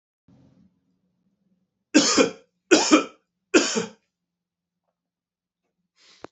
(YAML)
three_cough_length: 6.3 s
three_cough_amplitude: 27958
three_cough_signal_mean_std_ratio: 0.28
survey_phase: beta (2021-08-13 to 2022-03-07)
age: 45-64
gender: Male
wearing_mask: 'No'
symptom_cough_any: true
symptom_new_continuous_cough: true
symptom_runny_or_blocked_nose: true
symptom_fatigue: true
symptom_onset: 5 days
smoker_status: Never smoked
respiratory_condition_asthma: false
respiratory_condition_other: false
recruitment_source: Test and Trace
submission_delay: 2 days
covid_test_result: Positive
covid_test_method: RT-qPCR
covid_ct_value: 24.2
covid_ct_gene: N gene